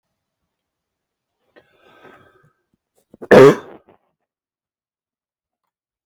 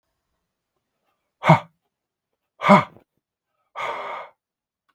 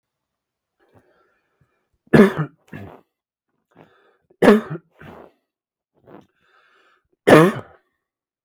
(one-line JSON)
{"cough_length": "6.1 s", "cough_amplitude": 32768, "cough_signal_mean_std_ratio": 0.17, "exhalation_length": "4.9 s", "exhalation_amplitude": 32768, "exhalation_signal_mean_std_ratio": 0.23, "three_cough_length": "8.4 s", "three_cough_amplitude": 32768, "three_cough_signal_mean_std_ratio": 0.23, "survey_phase": "beta (2021-08-13 to 2022-03-07)", "age": "18-44", "gender": "Male", "wearing_mask": "No", "symptom_none": true, "smoker_status": "Ex-smoker", "respiratory_condition_asthma": false, "respiratory_condition_other": false, "recruitment_source": "REACT", "submission_delay": "1 day", "covid_test_result": "Negative", "covid_test_method": "RT-qPCR", "influenza_a_test_result": "Negative", "influenza_b_test_result": "Negative"}